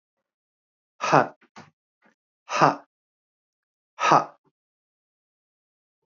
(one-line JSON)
{"exhalation_length": "6.1 s", "exhalation_amplitude": 28034, "exhalation_signal_mean_std_ratio": 0.23, "survey_phase": "beta (2021-08-13 to 2022-03-07)", "age": "18-44", "gender": "Male", "wearing_mask": "No", "symptom_fatigue": true, "symptom_headache": true, "symptom_change_to_sense_of_smell_or_taste": true, "symptom_onset": "4 days", "smoker_status": "Never smoked", "respiratory_condition_asthma": false, "respiratory_condition_other": false, "recruitment_source": "Test and Trace", "submission_delay": "2 days", "covid_test_result": "Positive", "covid_test_method": "ePCR"}